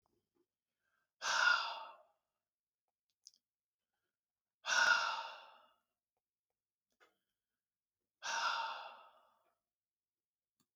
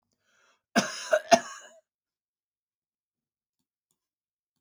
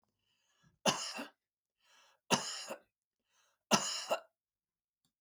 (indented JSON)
{
  "exhalation_length": "10.8 s",
  "exhalation_amplitude": 3875,
  "exhalation_signal_mean_std_ratio": 0.31,
  "cough_length": "4.6 s",
  "cough_amplitude": 22105,
  "cough_signal_mean_std_ratio": 0.19,
  "three_cough_length": "5.2 s",
  "three_cough_amplitude": 8441,
  "three_cough_signal_mean_std_ratio": 0.31,
  "survey_phase": "beta (2021-08-13 to 2022-03-07)",
  "age": "65+",
  "gender": "Male",
  "wearing_mask": "No",
  "symptom_none": true,
  "smoker_status": "Never smoked",
  "respiratory_condition_asthma": false,
  "respiratory_condition_other": false,
  "recruitment_source": "REACT",
  "submission_delay": "1 day",
  "covid_test_result": "Negative",
  "covid_test_method": "RT-qPCR",
  "influenza_a_test_result": "Negative",
  "influenza_b_test_result": "Negative"
}